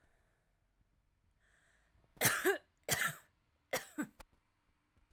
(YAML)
three_cough_length: 5.1 s
three_cough_amplitude: 4374
three_cough_signal_mean_std_ratio: 0.31
survey_phase: alpha (2021-03-01 to 2021-08-12)
age: 18-44
gender: Female
wearing_mask: 'No'
symptom_none: true
symptom_onset: 12 days
smoker_status: Ex-smoker
respiratory_condition_asthma: false
respiratory_condition_other: false
recruitment_source: REACT
submission_delay: 1 day
covid_test_result: Negative
covid_test_method: RT-qPCR